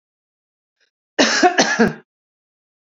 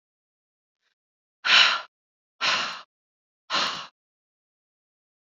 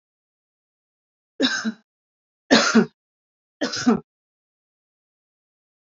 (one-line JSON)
{"cough_length": "2.8 s", "cough_amplitude": 30545, "cough_signal_mean_std_ratio": 0.37, "exhalation_length": "5.4 s", "exhalation_amplitude": 20580, "exhalation_signal_mean_std_ratio": 0.3, "three_cough_length": "5.8 s", "three_cough_amplitude": 26974, "three_cough_signal_mean_std_ratio": 0.29, "survey_phase": "beta (2021-08-13 to 2022-03-07)", "age": "45-64", "gender": "Female", "wearing_mask": "No", "symptom_runny_or_blocked_nose": true, "symptom_fatigue": true, "symptom_headache": true, "smoker_status": "Ex-smoker", "respiratory_condition_asthma": false, "respiratory_condition_other": false, "recruitment_source": "REACT", "submission_delay": "1 day", "covid_test_result": "Negative", "covid_test_method": "RT-qPCR"}